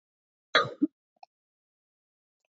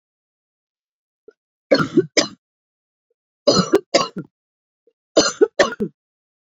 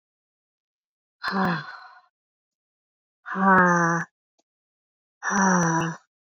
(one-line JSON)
{"cough_length": "2.6 s", "cough_amplitude": 11575, "cough_signal_mean_std_ratio": 0.2, "three_cough_length": "6.6 s", "three_cough_amplitude": 31973, "three_cough_signal_mean_std_ratio": 0.31, "exhalation_length": "6.3 s", "exhalation_amplitude": 17688, "exhalation_signal_mean_std_ratio": 0.44, "survey_phase": "beta (2021-08-13 to 2022-03-07)", "age": "18-44", "gender": "Female", "wearing_mask": "No", "symptom_cough_any": true, "symptom_new_continuous_cough": true, "symptom_runny_or_blocked_nose": true, "symptom_shortness_of_breath": true, "symptom_sore_throat": true, "symptom_diarrhoea": true, "symptom_fatigue": true, "symptom_headache": true, "symptom_change_to_sense_of_smell_or_taste": true, "symptom_loss_of_taste": true, "symptom_onset": "3 days", "smoker_status": "Never smoked", "respiratory_condition_asthma": true, "respiratory_condition_other": false, "recruitment_source": "Test and Trace", "submission_delay": "1 day", "covid_test_result": "Positive", "covid_test_method": "RT-qPCR", "covid_ct_value": 16.4, "covid_ct_gene": "ORF1ab gene", "covid_ct_mean": 16.7, "covid_viral_load": "3200000 copies/ml", "covid_viral_load_category": "High viral load (>1M copies/ml)"}